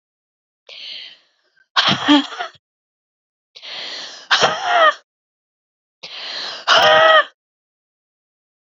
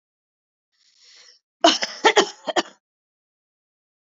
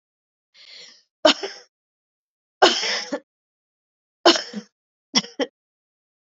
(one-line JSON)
{"exhalation_length": "8.8 s", "exhalation_amplitude": 31886, "exhalation_signal_mean_std_ratio": 0.39, "cough_length": "4.0 s", "cough_amplitude": 27510, "cough_signal_mean_std_ratio": 0.26, "three_cough_length": "6.2 s", "three_cough_amplitude": 32024, "three_cough_signal_mean_std_ratio": 0.27, "survey_phase": "beta (2021-08-13 to 2022-03-07)", "age": "18-44", "gender": "Female", "wearing_mask": "No", "symptom_cough_any": true, "symptom_runny_or_blocked_nose": true, "symptom_sore_throat": true, "symptom_other": true, "smoker_status": "Never smoked", "respiratory_condition_asthma": true, "respiratory_condition_other": false, "recruitment_source": "Test and Trace", "submission_delay": "1 day", "covid_test_result": "Positive", "covid_test_method": "RT-qPCR", "covid_ct_value": 17.8, "covid_ct_gene": "ORF1ab gene", "covid_ct_mean": 18.3, "covid_viral_load": "1000000 copies/ml", "covid_viral_load_category": "High viral load (>1M copies/ml)"}